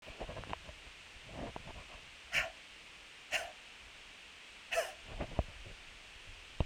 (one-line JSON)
{"exhalation_length": "6.7 s", "exhalation_amplitude": 5281, "exhalation_signal_mean_std_ratio": 0.54, "survey_phase": "beta (2021-08-13 to 2022-03-07)", "age": "45-64", "gender": "Female", "wearing_mask": "No", "symptom_sore_throat": true, "symptom_fatigue": true, "symptom_onset": "13 days", "smoker_status": "Ex-smoker", "respiratory_condition_asthma": false, "respiratory_condition_other": false, "recruitment_source": "REACT", "submission_delay": "3 days", "covid_test_result": "Negative", "covid_test_method": "RT-qPCR"}